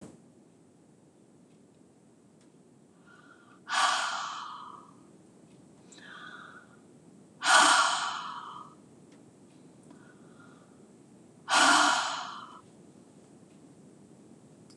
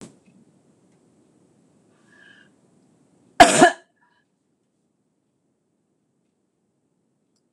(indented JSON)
{
  "exhalation_length": "14.8 s",
  "exhalation_amplitude": 12507,
  "exhalation_signal_mean_std_ratio": 0.35,
  "cough_length": "7.5 s",
  "cough_amplitude": 26028,
  "cough_signal_mean_std_ratio": 0.15,
  "survey_phase": "beta (2021-08-13 to 2022-03-07)",
  "age": "65+",
  "gender": "Female",
  "wearing_mask": "No",
  "symptom_none": true,
  "smoker_status": "Never smoked",
  "respiratory_condition_asthma": false,
  "respiratory_condition_other": false,
  "recruitment_source": "REACT",
  "submission_delay": "1 day",
  "covid_test_result": "Negative",
  "covid_test_method": "RT-qPCR",
  "influenza_a_test_result": "Negative",
  "influenza_b_test_result": "Negative"
}